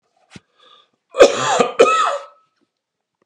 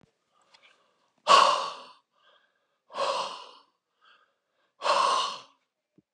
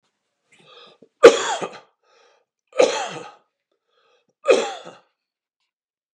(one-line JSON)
{"cough_length": "3.3 s", "cough_amplitude": 32768, "cough_signal_mean_std_ratio": 0.38, "exhalation_length": "6.1 s", "exhalation_amplitude": 18909, "exhalation_signal_mean_std_ratio": 0.34, "three_cough_length": "6.1 s", "three_cough_amplitude": 32768, "three_cough_signal_mean_std_ratio": 0.24, "survey_phase": "beta (2021-08-13 to 2022-03-07)", "age": "45-64", "gender": "Male", "wearing_mask": "No", "symptom_none": true, "smoker_status": "Ex-smoker", "respiratory_condition_asthma": false, "respiratory_condition_other": false, "recruitment_source": "REACT", "submission_delay": "2 days", "covid_test_result": "Negative", "covid_test_method": "RT-qPCR", "influenza_a_test_result": "Negative", "influenza_b_test_result": "Negative"}